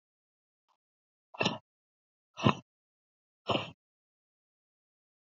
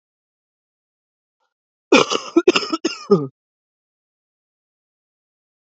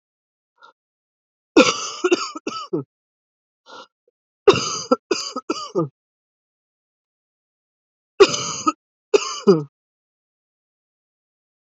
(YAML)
exhalation_length: 5.4 s
exhalation_amplitude: 14371
exhalation_signal_mean_std_ratio: 0.2
cough_length: 5.6 s
cough_amplitude: 28150
cough_signal_mean_std_ratio: 0.25
three_cough_length: 11.6 s
three_cough_amplitude: 28694
three_cough_signal_mean_std_ratio: 0.28
survey_phase: beta (2021-08-13 to 2022-03-07)
age: 18-44
gender: Female
wearing_mask: 'No'
symptom_fatigue: true
symptom_fever_high_temperature: true
symptom_headache: true
symptom_onset: 2 days
smoker_status: Ex-smoker
respiratory_condition_asthma: false
respiratory_condition_other: false
recruitment_source: Test and Trace
submission_delay: 1 day
covid_test_result: Positive
covid_test_method: RT-qPCR